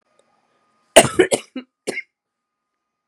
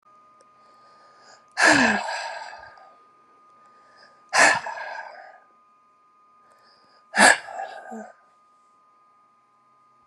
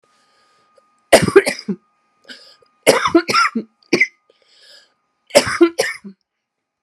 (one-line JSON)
{"cough_length": "3.1 s", "cough_amplitude": 32768, "cough_signal_mean_std_ratio": 0.23, "exhalation_length": "10.1 s", "exhalation_amplitude": 30960, "exhalation_signal_mean_std_ratio": 0.3, "three_cough_length": "6.8 s", "three_cough_amplitude": 32768, "three_cough_signal_mean_std_ratio": 0.34, "survey_phase": "beta (2021-08-13 to 2022-03-07)", "age": "18-44", "gender": "Female", "wearing_mask": "No", "symptom_cough_any": true, "symptom_sore_throat": true, "symptom_fatigue": true, "symptom_fever_high_temperature": true, "symptom_headache": true, "symptom_change_to_sense_of_smell_or_taste": true, "symptom_loss_of_taste": true, "symptom_onset": "5 days", "smoker_status": "Never smoked", "respiratory_condition_asthma": false, "respiratory_condition_other": true, "recruitment_source": "Test and Trace", "submission_delay": "2 days", "covid_test_result": "Positive", "covid_test_method": "RT-qPCR", "covid_ct_value": 15.4, "covid_ct_gene": "ORF1ab gene", "covid_ct_mean": 16.5, "covid_viral_load": "3800000 copies/ml", "covid_viral_load_category": "High viral load (>1M copies/ml)"}